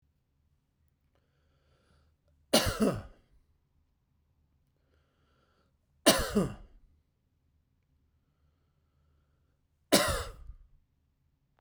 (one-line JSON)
{"three_cough_length": "11.6 s", "three_cough_amplitude": 14857, "three_cough_signal_mean_std_ratio": 0.24, "survey_phase": "beta (2021-08-13 to 2022-03-07)", "age": "45-64", "gender": "Male", "wearing_mask": "No", "symptom_fatigue": true, "symptom_headache": true, "smoker_status": "Never smoked", "respiratory_condition_asthma": false, "respiratory_condition_other": false, "recruitment_source": "REACT", "submission_delay": "2 days", "covid_test_result": "Negative", "covid_test_method": "RT-qPCR"}